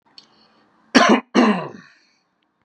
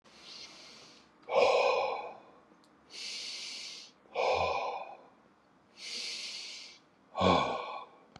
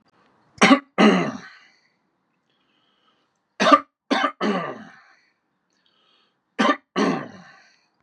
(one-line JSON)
{"cough_length": "2.6 s", "cough_amplitude": 32767, "cough_signal_mean_std_ratio": 0.36, "exhalation_length": "8.2 s", "exhalation_amplitude": 8563, "exhalation_signal_mean_std_ratio": 0.51, "three_cough_length": "8.0 s", "three_cough_amplitude": 31217, "three_cough_signal_mean_std_ratio": 0.34, "survey_phase": "beta (2021-08-13 to 2022-03-07)", "age": "18-44", "gender": "Male", "wearing_mask": "No", "symptom_none": true, "smoker_status": "Ex-smoker", "respiratory_condition_asthma": false, "respiratory_condition_other": false, "recruitment_source": "REACT", "submission_delay": "2 days", "covid_test_result": "Negative", "covid_test_method": "RT-qPCR", "influenza_a_test_result": "Negative", "influenza_b_test_result": "Negative"}